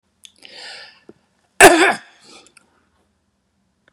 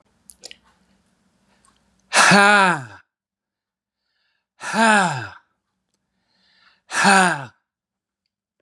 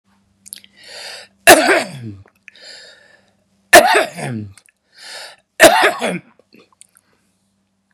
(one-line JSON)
{"cough_length": "3.9 s", "cough_amplitude": 32768, "cough_signal_mean_std_ratio": 0.23, "exhalation_length": "8.6 s", "exhalation_amplitude": 32308, "exhalation_signal_mean_std_ratio": 0.33, "three_cough_length": "7.9 s", "three_cough_amplitude": 32768, "three_cough_signal_mean_std_ratio": 0.32, "survey_phase": "beta (2021-08-13 to 2022-03-07)", "age": "65+", "gender": "Male", "wearing_mask": "No", "symptom_none": true, "smoker_status": "Ex-smoker", "respiratory_condition_asthma": false, "respiratory_condition_other": false, "recruitment_source": "REACT", "submission_delay": "1 day", "covid_test_result": "Negative", "covid_test_method": "RT-qPCR", "influenza_a_test_result": "Negative", "influenza_b_test_result": "Negative"}